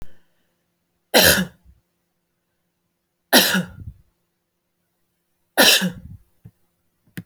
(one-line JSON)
{"three_cough_length": "7.3 s", "three_cough_amplitude": 32768, "three_cough_signal_mean_std_ratio": 0.3, "survey_phase": "beta (2021-08-13 to 2022-03-07)", "age": "45-64", "gender": "Female", "wearing_mask": "No", "symptom_none": true, "smoker_status": "Never smoked", "respiratory_condition_asthma": false, "respiratory_condition_other": false, "recruitment_source": "Test and Trace", "submission_delay": "0 days", "covid_test_result": "Negative", "covid_test_method": "LFT"}